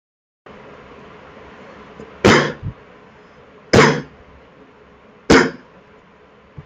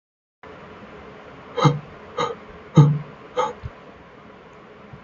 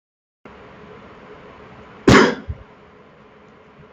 {"three_cough_length": "6.7 s", "three_cough_amplitude": 28621, "three_cough_signal_mean_std_ratio": 0.31, "exhalation_length": "5.0 s", "exhalation_amplitude": 26465, "exhalation_signal_mean_std_ratio": 0.35, "cough_length": "3.9 s", "cough_amplitude": 30071, "cough_signal_mean_std_ratio": 0.27, "survey_phase": "beta (2021-08-13 to 2022-03-07)", "age": "18-44", "gender": "Male", "wearing_mask": "No", "symptom_runny_or_blocked_nose": true, "symptom_headache": true, "smoker_status": "Never smoked", "respiratory_condition_asthma": false, "respiratory_condition_other": false, "recruitment_source": "REACT", "submission_delay": "1 day", "covid_test_result": "Negative", "covid_test_method": "RT-qPCR", "influenza_a_test_result": "Negative", "influenza_b_test_result": "Negative"}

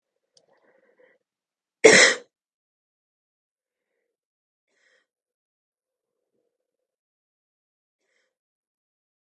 {"three_cough_length": "9.2 s", "three_cough_amplitude": 32768, "three_cough_signal_mean_std_ratio": 0.14, "survey_phase": "beta (2021-08-13 to 2022-03-07)", "age": "18-44", "gender": "Female", "wearing_mask": "No", "symptom_runny_or_blocked_nose": true, "symptom_sore_throat": true, "symptom_headache": true, "symptom_onset": "2 days", "smoker_status": "Never smoked", "respiratory_condition_asthma": false, "respiratory_condition_other": false, "recruitment_source": "Test and Trace", "submission_delay": "2 days", "covid_test_result": "Positive", "covid_test_method": "RT-qPCR", "covid_ct_value": 21.3, "covid_ct_gene": "N gene", "covid_ct_mean": 21.9, "covid_viral_load": "64000 copies/ml", "covid_viral_load_category": "Low viral load (10K-1M copies/ml)"}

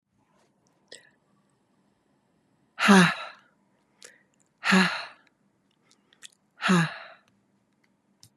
{"exhalation_length": "8.4 s", "exhalation_amplitude": 21356, "exhalation_signal_mean_std_ratio": 0.27, "survey_phase": "beta (2021-08-13 to 2022-03-07)", "age": "65+", "gender": "Female", "wearing_mask": "No", "symptom_none": true, "smoker_status": "Ex-smoker", "respiratory_condition_asthma": false, "respiratory_condition_other": false, "recruitment_source": "REACT", "submission_delay": "2 days", "covid_test_result": "Negative", "covid_test_method": "RT-qPCR", "influenza_a_test_result": "Negative", "influenza_b_test_result": "Negative"}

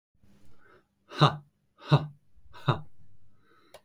{"exhalation_length": "3.8 s", "exhalation_amplitude": 17467, "exhalation_signal_mean_std_ratio": 0.31, "survey_phase": "beta (2021-08-13 to 2022-03-07)", "age": "18-44", "gender": "Male", "wearing_mask": "No", "symptom_prefer_not_to_say": true, "smoker_status": "Never smoked", "respiratory_condition_asthma": false, "respiratory_condition_other": false, "recruitment_source": "REACT", "submission_delay": "2 days", "covid_test_result": "Negative", "covid_test_method": "RT-qPCR"}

